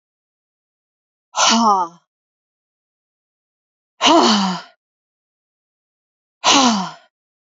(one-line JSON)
{"exhalation_length": "7.5 s", "exhalation_amplitude": 30501, "exhalation_signal_mean_std_ratio": 0.36, "survey_phase": "alpha (2021-03-01 to 2021-08-12)", "age": "45-64", "gender": "Female", "wearing_mask": "No", "symptom_fatigue": true, "symptom_onset": "12 days", "smoker_status": "Never smoked", "respiratory_condition_asthma": false, "respiratory_condition_other": false, "recruitment_source": "REACT", "submission_delay": "0 days", "covid_test_result": "Negative", "covid_test_method": "RT-qPCR"}